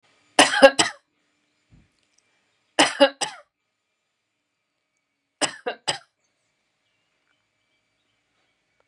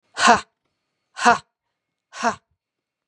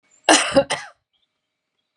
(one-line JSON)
{"three_cough_length": "8.9 s", "three_cough_amplitude": 32768, "three_cough_signal_mean_std_ratio": 0.2, "exhalation_length": "3.1 s", "exhalation_amplitude": 32587, "exhalation_signal_mean_std_ratio": 0.28, "cough_length": "2.0 s", "cough_amplitude": 31605, "cough_signal_mean_std_ratio": 0.33, "survey_phase": "beta (2021-08-13 to 2022-03-07)", "age": "45-64", "gender": "Female", "wearing_mask": "No", "symptom_none": true, "smoker_status": "Ex-smoker", "respiratory_condition_asthma": true, "respiratory_condition_other": false, "recruitment_source": "REACT", "submission_delay": "2 days", "covid_test_result": "Negative", "covid_test_method": "RT-qPCR", "influenza_a_test_result": "Negative", "influenza_b_test_result": "Negative"}